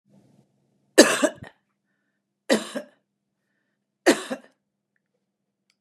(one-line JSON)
{"three_cough_length": "5.8 s", "three_cough_amplitude": 32767, "three_cough_signal_mean_std_ratio": 0.22, "survey_phase": "beta (2021-08-13 to 2022-03-07)", "age": "65+", "gender": "Female", "wearing_mask": "No", "symptom_none": true, "smoker_status": "Never smoked", "respiratory_condition_asthma": false, "respiratory_condition_other": false, "recruitment_source": "REACT", "submission_delay": "2 days", "covid_test_result": "Negative", "covid_test_method": "RT-qPCR", "influenza_a_test_result": "Negative", "influenza_b_test_result": "Negative"}